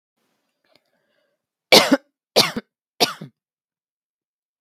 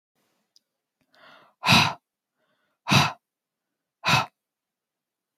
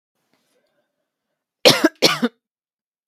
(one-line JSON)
{"three_cough_length": "4.6 s", "three_cough_amplitude": 32768, "three_cough_signal_mean_std_ratio": 0.23, "exhalation_length": "5.4 s", "exhalation_amplitude": 21530, "exhalation_signal_mean_std_ratio": 0.28, "cough_length": "3.1 s", "cough_amplitude": 32768, "cough_signal_mean_std_ratio": 0.26, "survey_phase": "beta (2021-08-13 to 2022-03-07)", "age": "45-64", "gender": "Female", "wearing_mask": "No", "symptom_cough_any": true, "symptom_sore_throat": true, "symptom_onset": "12 days", "smoker_status": "Ex-smoker", "respiratory_condition_asthma": false, "respiratory_condition_other": false, "recruitment_source": "REACT", "submission_delay": "1 day", "covid_test_result": "Negative", "covid_test_method": "RT-qPCR"}